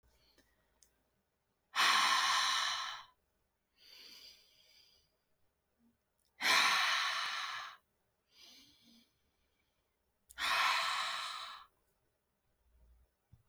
{"exhalation_length": "13.5 s", "exhalation_amplitude": 4771, "exhalation_signal_mean_std_ratio": 0.42, "survey_phase": "alpha (2021-03-01 to 2021-08-12)", "age": "18-44", "gender": "Female", "wearing_mask": "No", "symptom_cough_any": true, "symptom_shortness_of_breath": true, "symptom_fatigue": true, "symptom_fever_high_temperature": true, "symptom_headache": true, "symptom_onset": "3 days", "smoker_status": "Never smoked", "respiratory_condition_asthma": false, "respiratory_condition_other": false, "recruitment_source": "Test and Trace", "submission_delay": "2 days", "covid_test_result": "Positive", "covid_test_method": "RT-qPCR"}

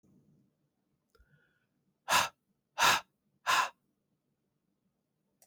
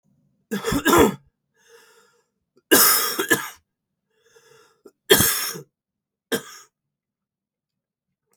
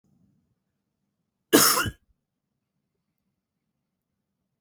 {"exhalation_length": "5.5 s", "exhalation_amplitude": 7628, "exhalation_signal_mean_std_ratio": 0.27, "three_cough_length": "8.4 s", "three_cough_amplitude": 32768, "three_cough_signal_mean_std_ratio": 0.33, "cough_length": "4.6 s", "cough_amplitude": 27291, "cough_signal_mean_std_ratio": 0.21, "survey_phase": "beta (2021-08-13 to 2022-03-07)", "age": "45-64", "gender": "Male", "wearing_mask": "No", "symptom_cough_any": true, "symptom_runny_or_blocked_nose": true, "symptom_sore_throat": true, "symptom_headache": true, "symptom_change_to_sense_of_smell_or_taste": true, "symptom_loss_of_taste": true, "symptom_onset": "4 days", "smoker_status": "Never smoked", "respiratory_condition_asthma": false, "respiratory_condition_other": false, "recruitment_source": "Test and Trace", "submission_delay": "2 days", "covid_test_result": "Positive", "covid_test_method": "RT-qPCR", "covid_ct_value": 17.8, "covid_ct_gene": "ORF1ab gene", "covid_ct_mean": 18.1, "covid_viral_load": "1200000 copies/ml", "covid_viral_load_category": "High viral load (>1M copies/ml)"}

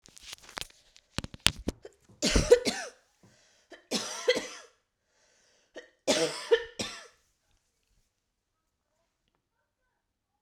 {"three_cough_length": "10.4 s", "three_cough_amplitude": 32768, "three_cough_signal_mean_std_ratio": 0.27, "survey_phase": "beta (2021-08-13 to 2022-03-07)", "age": "18-44", "gender": "Female", "wearing_mask": "No", "symptom_runny_or_blocked_nose": true, "symptom_headache": true, "symptom_change_to_sense_of_smell_or_taste": true, "symptom_loss_of_taste": true, "symptom_onset": "2 days", "smoker_status": "Never smoked", "respiratory_condition_asthma": false, "respiratory_condition_other": false, "recruitment_source": "Test and Trace", "submission_delay": "2 days", "covid_test_result": "Positive", "covid_test_method": "RT-qPCR", "covid_ct_value": 22.4, "covid_ct_gene": "ORF1ab gene"}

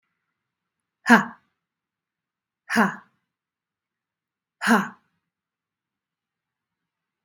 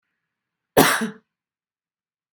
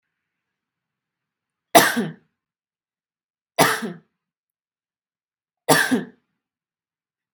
{"exhalation_length": "7.2 s", "exhalation_amplitude": 32523, "exhalation_signal_mean_std_ratio": 0.21, "cough_length": "2.3 s", "cough_amplitude": 32767, "cough_signal_mean_std_ratio": 0.26, "three_cough_length": "7.3 s", "three_cough_amplitude": 32768, "three_cough_signal_mean_std_ratio": 0.25, "survey_phase": "beta (2021-08-13 to 2022-03-07)", "age": "18-44", "gender": "Female", "wearing_mask": "No", "symptom_runny_or_blocked_nose": true, "symptom_onset": "13 days", "smoker_status": "Ex-smoker", "respiratory_condition_asthma": false, "respiratory_condition_other": false, "recruitment_source": "REACT", "submission_delay": "1 day", "covid_test_result": "Negative", "covid_test_method": "RT-qPCR", "influenza_a_test_result": "Negative", "influenza_b_test_result": "Negative"}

